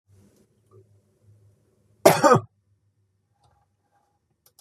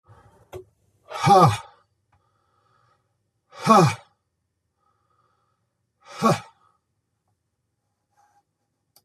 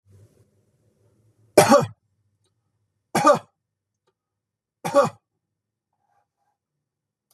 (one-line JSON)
{"cough_length": "4.6 s", "cough_amplitude": 30239, "cough_signal_mean_std_ratio": 0.2, "exhalation_length": "9.0 s", "exhalation_amplitude": 29403, "exhalation_signal_mean_std_ratio": 0.25, "three_cough_length": "7.3 s", "three_cough_amplitude": 32754, "three_cough_signal_mean_std_ratio": 0.23, "survey_phase": "beta (2021-08-13 to 2022-03-07)", "age": "65+", "gender": "Male", "wearing_mask": "No", "symptom_none": true, "smoker_status": "Never smoked", "respiratory_condition_asthma": false, "respiratory_condition_other": false, "recruitment_source": "REACT", "submission_delay": "2 days", "covid_test_result": "Negative", "covid_test_method": "RT-qPCR", "influenza_a_test_result": "Negative", "influenza_b_test_result": "Negative"}